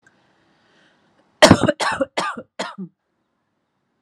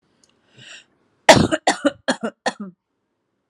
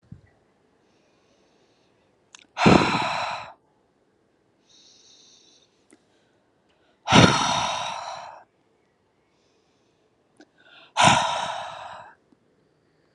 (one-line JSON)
{"cough_length": "4.0 s", "cough_amplitude": 32768, "cough_signal_mean_std_ratio": 0.27, "three_cough_length": "3.5 s", "three_cough_amplitude": 32768, "three_cough_signal_mean_std_ratio": 0.28, "exhalation_length": "13.1 s", "exhalation_amplitude": 29154, "exhalation_signal_mean_std_ratio": 0.3, "survey_phase": "alpha (2021-03-01 to 2021-08-12)", "age": "18-44", "gender": "Female", "wearing_mask": "No", "symptom_none": true, "smoker_status": "Never smoked", "respiratory_condition_asthma": false, "respiratory_condition_other": false, "recruitment_source": "REACT", "submission_delay": "1 day", "covid_test_result": "Negative", "covid_test_method": "RT-qPCR"}